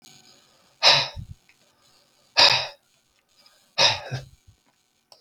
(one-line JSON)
{"exhalation_length": "5.2 s", "exhalation_amplitude": 32766, "exhalation_signal_mean_std_ratio": 0.31, "survey_phase": "beta (2021-08-13 to 2022-03-07)", "age": "65+", "gender": "Male", "wearing_mask": "No", "symptom_none": true, "smoker_status": "Ex-smoker", "respiratory_condition_asthma": true, "respiratory_condition_other": false, "recruitment_source": "REACT", "submission_delay": "1 day", "covid_test_result": "Negative", "covid_test_method": "RT-qPCR", "influenza_a_test_result": "Unknown/Void", "influenza_b_test_result": "Unknown/Void"}